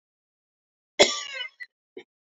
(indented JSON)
{
  "cough_length": "2.4 s",
  "cough_amplitude": 26836,
  "cough_signal_mean_std_ratio": 0.23,
  "survey_phase": "beta (2021-08-13 to 2022-03-07)",
  "age": "45-64",
  "gender": "Female",
  "wearing_mask": "No",
  "symptom_cough_any": true,
  "symptom_runny_or_blocked_nose": true,
  "symptom_loss_of_taste": true,
  "symptom_other": true,
  "symptom_onset": "3 days",
  "smoker_status": "Ex-smoker",
  "respiratory_condition_asthma": false,
  "respiratory_condition_other": false,
  "recruitment_source": "Test and Trace",
  "submission_delay": "1 day",
  "covid_test_result": "Positive",
  "covid_test_method": "RT-qPCR",
  "covid_ct_value": 18.5,
  "covid_ct_gene": "N gene"
}